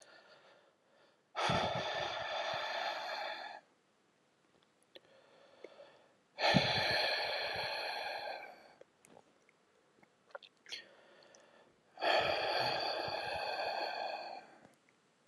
{"exhalation_length": "15.3 s", "exhalation_amplitude": 6360, "exhalation_signal_mean_std_ratio": 0.57, "survey_phase": "alpha (2021-03-01 to 2021-08-12)", "age": "18-44", "gender": "Male", "wearing_mask": "No", "symptom_cough_any": true, "symptom_headache": true, "symptom_change_to_sense_of_smell_or_taste": true, "symptom_onset": "4 days", "smoker_status": "Never smoked", "respiratory_condition_asthma": true, "respiratory_condition_other": false, "recruitment_source": "Test and Trace", "submission_delay": "2 days", "covid_test_result": "Positive", "covid_test_method": "RT-qPCR", "covid_ct_value": 15.1, "covid_ct_gene": "ORF1ab gene", "covid_ct_mean": 16.3, "covid_viral_load": "4400000 copies/ml", "covid_viral_load_category": "High viral load (>1M copies/ml)"}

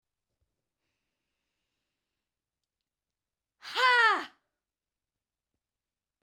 {"exhalation_length": "6.2 s", "exhalation_amplitude": 8948, "exhalation_signal_mean_std_ratio": 0.22, "survey_phase": "beta (2021-08-13 to 2022-03-07)", "age": "65+", "gender": "Female", "wearing_mask": "No", "symptom_headache": true, "smoker_status": "Never smoked", "respiratory_condition_asthma": false, "respiratory_condition_other": false, "recruitment_source": "REACT", "submission_delay": "2 days", "covid_test_result": "Negative", "covid_test_method": "RT-qPCR"}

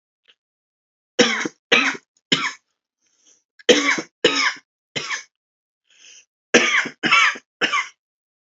{"three_cough_length": "8.4 s", "three_cough_amplitude": 30087, "three_cough_signal_mean_std_ratio": 0.39, "survey_phase": "alpha (2021-03-01 to 2021-08-12)", "age": "18-44", "gender": "Male", "wearing_mask": "No", "symptom_none": true, "symptom_cough_any": true, "symptom_onset": "4 days", "smoker_status": "Current smoker (1 to 10 cigarettes per day)", "respiratory_condition_asthma": false, "respiratory_condition_other": false, "recruitment_source": "Test and Trace", "submission_delay": "2 days", "covid_test_result": "Positive", "covid_test_method": "RT-qPCR", "covid_ct_value": 14.0, "covid_ct_gene": "ORF1ab gene", "covid_ct_mean": 14.3, "covid_viral_load": "21000000 copies/ml", "covid_viral_load_category": "High viral load (>1M copies/ml)"}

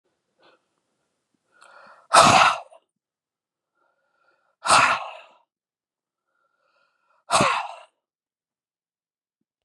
{"exhalation_length": "9.6 s", "exhalation_amplitude": 29885, "exhalation_signal_mean_std_ratio": 0.26, "survey_phase": "beta (2021-08-13 to 2022-03-07)", "age": "18-44", "gender": "Male", "wearing_mask": "No", "symptom_none": true, "smoker_status": "Never smoked", "respiratory_condition_asthma": false, "respiratory_condition_other": false, "recruitment_source": "REACT", "submission_delay": "1 day", "covid_test_result": "Negative", "covid_test_method": "RT-qPCR", "influenza_a_test_result": "Negative", "influenza_b_test_result": "Negative"}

